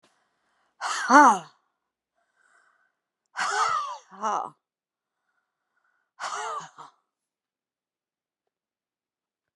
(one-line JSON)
{"exhalation_length": "9.6 s", "exhalation_amplitude": 28879, "exhalation_signal_mean_std_ratio": 0.26, "survey_phase": "beta (2021-08-13 to 2022-03-07)", "age": "65+", "gender": "Female", "wearing_mask": "No", "symptom_none": true, "smoker_status": "Never smoked", "respiratory_condition_asthma": true, "respiratory_condition_other": false, "recruitment_source": "REACT", "submission_delay": "2 days", "covid_test_result": "Negative", "covid_test_method": "RT-qPCR"}